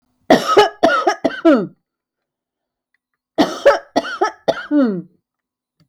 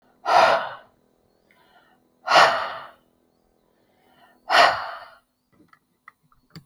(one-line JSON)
{"cough_length": "5.9 s", "cough_amplitude": 32768, "cough_signal_mean_std_ratio": 0.44, "exhalation_length": "6.7 s", "exhalation_amplitude": 29844, "exhalation_signal_mean_std_ratio": 0.33, "survey_phase": "beta (2021-08-13 to 2022-03-07)", "age": "45-64", "gender": "Female", "wearing_mask": "No", "symptom_none": true, "smoker_status": "Ex-smoker", "respiratory_condition_asthma": true, "respiratory_condition_other": false, "recruitment_source": "REACT", "submission_delay": "3 days", "covid_test_result": "Negative", "covid_test_method": "RT-qPCR", "influenza_a_test_result": "Negative", "influenza_b_test_result": "Negative"}